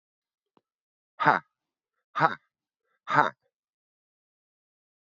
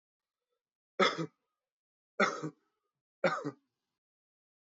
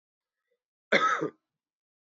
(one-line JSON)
{"exhalation_length": "5.1 s", "exhalation_amplitude": 18582, "exhalation_signal_mean_std_ratio": 0.21, "three_cough_length": "4.7 s", "three_cough_amplitude": 7516, "three_cough_signal_mean_std_ratio": 0.27, "cough_length": "2.0 s", "cough_amplitude": 12072, "cough_signal_mean_std_ratio": 0.32, "survey_phase": "beta (2021-08-13 to 2022-03-07)", "age": "45-64", "gender": "Male", "wearing_mask": "No", "symptom_cough_any": true, "symptom_runny_or_blocked_nose": true, "symptom_shortness_of_breath": true, "symptom_sore_throat": true, "symptom_fatigue": true, "symptom_fever_high_temperature": true, "symptom_headache": true, "symptom_change_to_sense_of_smell_or_taste": true, "symptom_loss_of_taste": true, "symptom_onset": "2 days", "smoker_status": "Never smoked", "respiratory_condition_asthma": false, "respiratory_condition_other": false, "recruitment_source": "Test and Trace", "submission_delay": "1 day", "covid_test_result": "Positive", "covid_test_method": "ePCR"}